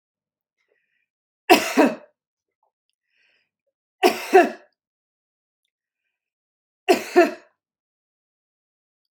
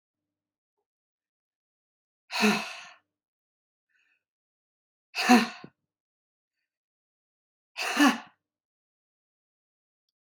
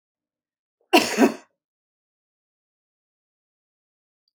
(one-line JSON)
{"three_cough_length": "9.2 s", "three_cough_amplitude": 32698, "three_cough_signal_mean_std_ratio": 0.23, "exhalation_length": "10.2 s", "exhalation_amplitude": 16191, "exhalation_signal_mean_std_ratio": 0.23, "cough_length": "4.4 s", "cough_amplitude": 28249, "cough_signal_mean_std_ratio": 0.2, "survey_phase": "beta (2021-08-13 to 2022-03-07)", "age": "45-64", "gender": "Female", "wearing_mask": "No", "symptom_none": true, "smoker_status": "Ex-smoker", "respiratory_condition_asthma": false, "respiratory_condition_other": false, "recruitment_source": "REACT", "submission_delay": "1 day", "covid_test_result": "Negative", "covid_test_method": "RT-qPCR", "influenza_a_test_result": "Negative", "influenza_b_test_result": "Negative"}